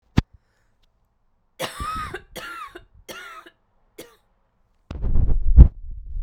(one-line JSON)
{"three_cough_length": "6.2 s", "three_cough_amplitude": 32768, "three_cough_signal_mean_std_ratio": 0.31, "survey_phase": "beta (2021-08-13 to 2022-03-07)", "age": "18-44", "gender": "Male", "wearing_mask": "No", "symptom_cough_any": true, "symptom_runny_or_blocked_nose": true, "symptom_sore_throat": true, "symptom_abdominal_pain": true, "symptom_fatigue": true, "symptom_headache": true, "symptom_change_to_sense_of_smell_or_taste": true, "symptom_onset": "7 days", "smoker_status": "Ex-smoker", "respiratory_condition_asthma": false, "respiratory_condition_other": false, "recruitment_source": "Test and Trace", "submission_delay": "2 days", "covid_test_result": "Positive", "covid_test_method": "RT-qPCR", "covid_ct_value": 15.7, "covid_ct_gene": "ORF1ab gene"}